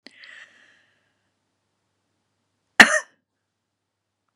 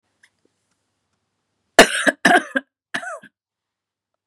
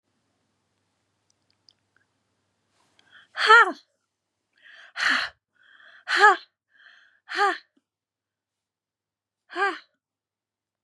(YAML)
cough_length: 4.4 s
cough_amplitude: 32768
cough_signal_mean_std_ratio: 0.13
three_cough_length: 4.3 s
three_cough_amplitude: 32768
three_cough_signal_mean_std_ratio: 0.25
exhalation_length: 10.8 s
exhalation_amplitude: 26753
exhalation_signal_mean_std_ratio: 0.23
survey_phase: beta (2021-08-13 to 2022-03-07)
age: 65+
gender: Female
wearing_mask: 'No'
symptom_cough_any: true
smoker_status: Never smoked
respiratory_condition_asthma: true
respiratory_condition_other: false
recruitment_source: REACT
submission_delay: 2 days
covid_test_result: Negative
covid_test_method: RT-qPCR
influenza_a_test_result: Negative
influenza_b_test_result: Negative